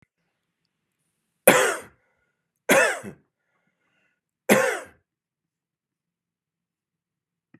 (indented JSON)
{
  "three_cough_length": "7.6 s",
  "three_cough_amplitude": 32745,
  "three_cough_signal_mean_std_ratio": 0.25,
  "survey_phase": "beta (2021-08-13 to 2022-03-07)",
  "age": "45-64",
  "gender": "Male",
  "wearing_mask": "No",
  "symptom_fatigue": true,
  "symptom_onset": "5 days",
  "smoker_status": "Never smoked",
  "respiratory_condition_asthma": false,
  "respiratory_condition_other": false,
  "recruitment_source": "REACT",
  "submission_delay": "0 days",
  "covid_test_result": "Negative",
  "covid_test_method": "RT-qPCR",
  "influenza_a_test_result": "Negative",
  "influenza_b_test_result": "Negative"
}